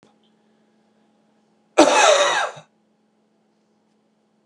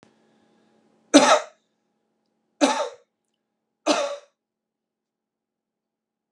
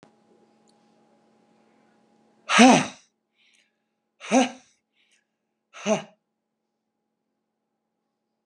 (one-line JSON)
{"cough_length": "4.5 s", "cough_amplitude": 32767, "cough_signal_mean_std_ratio": 0.31, "three_cough_length": "6.3 s", "three_cough_amplitude": 32308, "three_cough_signal_mean_std_ratio": 0.25, "exhalation_length": "8.5 s", "exhalation_amplitude": 30943, "exhalation_signal_mean_std_ratio": 0.21, "survey_phase": "beta (2021-08-13 to 2022-03-07)", "age": "45-64", "gender": "Male", "wearing_mask": "No", "symptom_none": true, "smoker_status": "Current smoker (1 to 10 cigarettes per day)", "respiratory_condition_asthma": false, "respiratory_condition_other": false, "recruitment_source": "REACT", "submission_delay": "32 days", "covid_test_result": "Negative", "covid_test_method": "RT-qPCR", "covid_ct_value": 38.0, "covid_ct_gene": "N gene", "influenza_a_test_result": "Unknown/Void", "influenza_b_test_result": "Unknown/Void"}